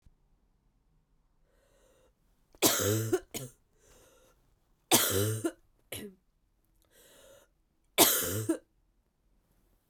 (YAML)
three_cough_length: 9.9 s
three_cough_amplitude: 17474
three_cough_signal_mean_std_ratio: 0.33
survey_phase: beta (2021-08-13 to 2022-03-07)
age: 18-44
gender: Female
wearing_mask: 'No'
symptom_cough_any: true
symptom_new_continuous_cough: true
symptom_runny_or_blocked_nose: true
symptom_shortness_of_breath: true
symptom_sore_throat: true
symptom_fatigue: true
symptom_fever_high_temperature: true
symptom_headache: true
symptom_change_to_sense_of_smell_or_taste: true
symptom_loss_of_taste: true
symptom_onset: 4 days
smoker_status: Ex-smoker
respiratory_condition_asthma: false
respiratory_condition_other: false
recruitment_source: Test and Trace
submission_delay: 1 day
covid_test_result: Positive
covid_test_method: RT-qPCR
covid_ct_value: 19.0
covid_ct_gene: ORF1ab gene